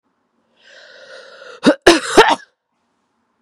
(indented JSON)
{
  "cough_length": "3.4 s",
  "cough_amplitude": 32768,
  "cough_signal_mean_std_ratio": 0.3,
  "survey_phase": "beta (2021-08-13 to 2022-03-07)",
  "age": "18-44",
  "gender": "Female",
  "wearing_mask": "No",
  "symptom_runny_or_blocked_nose": true,
  "symptom_sore_throat": true,
  "symptom_fatigue": true,
  "symptom_other": true,
  "symptom_onset": "6 days",
  "smoker_status": "Ex-smoker",
  "respiratory_condition_asthma": false,
  "respiratory_condition_other": false,
  "recruitment_source": "Test and Trace",
  "submission_delay": "2 days",
  "covid_test_result": "Positive",
  "covid_test_method": "RT-qPCR",
  "covid_ct_value": 16.3,
  "covid_ct_gene": "N gene",
  "covid_ct_mean": 16.4,
  "covid_viral_load": "4300000 copies/ml",
  "covid_viral_load_category": "High viral load (>1M copies/ml)"
}